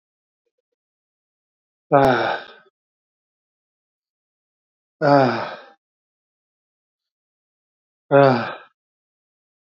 {
  "exhalation_length": "9.7 s",
  "exhalation_amplitude": 26170,
  "exhalation_signal_mean_std_ratio": 0.27,
  "survey_phase": "beta (2021-08-13 to 2022-03-07)",
  "age": "65+",
  "gender": "Male",
  "wearing_mask": "No",
  "symptom_none": true,
  "smoker_status": "Ex-smoker",
  "respiratory_condition_asthma": false,
  "respiratory_condition_other": false,
  "recruitment_source": "REACT",
  "submission_delay": "4 days",
  "covid_test_result": "Negative",
  "covid_test_method": "RT-qPCR",
  "influenza_a_test_result": "Negative",
  "influenza_b_test_result": "Positive",
  "influenza_b_ct_value": 34.5
}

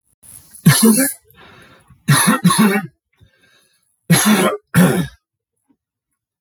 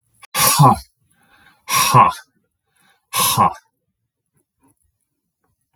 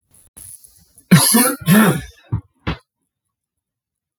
{
  "three_cough_length": "6.4 s",
  "three_cough_amplitude": 32768,
  "three_cough_signal_mean_std_ratio": 0.47,
  "exhalation_length": "5.8 s",
  "exhalation_amplitude": 32768,
  "exhalation_signal_mean_std_ratio": 0.36,
  "cough_length": "4.2 s",
  "cough_amplitude": 32768,
  "cough_signal_mean_std_ratio": 0.38,
  "survey_phase": "beta (2021-08-13 to 2022-03-07)",
  "age": "45-64",
  "gender": "Male",
  "wearing_mask": "No",
  "symptom_none": true,
  "smoker_status": "Never smoked",
  "respiratory_condition_asthma": false,
  "respiratory_condition_other": false,
  "recruitment_source": "REACT",
  "submission_delay": "2 days",
  "covid_test_result": "Negative",
  "covid_test_method": "RT-qPCR",
  "influenza_a_test_result": "Negative",
  "influenza_b_test_result": "Negative"
}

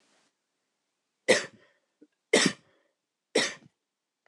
{
  "three_cough_length": "4.3 s",
  "three_cough_amplitude": 13646,
  "three_cough_signal_mean_std_ratio": 0.25,
  "survey_phase": "beta (2021-08-13 to 2022-03-07)",
  "age": "65+",
  "gender": "Female",
  "wearing_mask": "No",
  "symptom_none": true,
  "smoker_status": "Never smoked",
  "respiratory_condition_asthma": false,
  "respiratory_condition_other": false,
  "recruitment_source": "REACT",
  "submission_delay": "1 day",
  "covid_test_result": "Negative",
  "covid_test_method": "RT-qPCR"
}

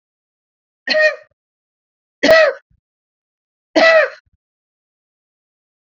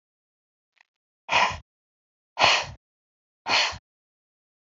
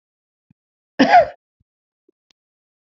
{
  "three_cough_length": "5.8 s",
  "three_cough_amplitude": 32767,
  "three_cough_signal_mean_std_ratio": 0.33,
  "exhalation_length": "4.7 s",
  "exhalation_amplitude": 21144,
  "exhalation_signal_mean_std_ratio": 0.31,
  "cough_length": "2.8 s",
  "cough_amplitude": 28705,
  "cough_signal_mean_std_ratio": 0.24,
  "survey_phase": "beta (2021-08-13 to 2022-03-07)",
  "age": "45-64",
  "gender": "Female",
  "wearing_mask": "No",
  "symptom_none": true,
  "smoker_status": "Never smoked",
  "respiratory_condition_asthma": false,
  "respiratory_condition_other": false,
  "recruitment_source": "REACT",
  "submission_delay": "8 days",
  "covid_test_result": "Negative",
  "covid_test_method": "RT-qPCR",
  "influenza_a_test_result": "Negative",
  "influenza_b_test_result": "Negative"
}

